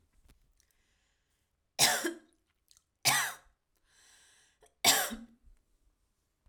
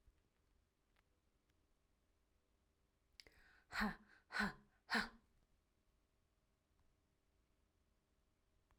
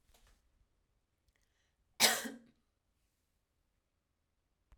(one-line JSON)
{"three_cough_length": "6.5 s", "three_cough_amplitude": 10119, "three_cough_signal_mean_std_ratio": 0.28, "exhalation_length": "8.8 s", "exhalation_amplitude": 1493, "exhalation_signal_mean_std_ratio": 0.23, "cough_length": "4.8 s", "cough_amplitude": 8636, "cough_signal_mean_std_ratio": 0.18, "survey_phase": "alpha (2021-03-01 to 2021-08-12)", "age": "18-44", "gender": "Female", "wearing_mask": "No", "symptom_abdominal_pain": true, "smoker_status": "Ex-smoker", "respiratory_condition_asthma": false, "respiratory_condition_other": false, "recruitment_source": "REACT", "submission_delay": "1 day", "covid_test_result": "Negative", "covid_test_method": "RT-qPCR"}